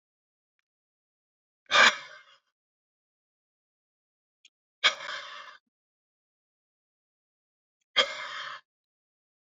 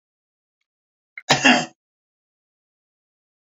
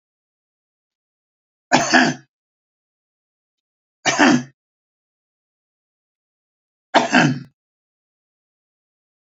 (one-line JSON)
{"exhalation_length": "9.6 s", "exhalation_amplitude": 16513, "exhalation_signal_mean_std_ratio": 0.2, "cough_length": "3.5 s", "cough_amplitude": 29408, "cough_signal_mean_std_ratio": 0.22, "three_cough_length": "9.4 s", "three_cough_amplitude": 32767, "three_cough_signal_mean_std_ratio": 0.26, "survey_phase": "beta (2021-08-13 to 2022-03-07)", "age": "65+", "gender": "Male", "wearing_mask": "No", "symptom_none": true, "smoker_status": "Ex-smoker", "respiratory_condition_asthma": false, "respiratory_condition_other": false, "recruitment_source": "REACT", "submission_delay": "0 days", "covid_test_result": "Negative", "covid_test_method": "RT-qPCR"}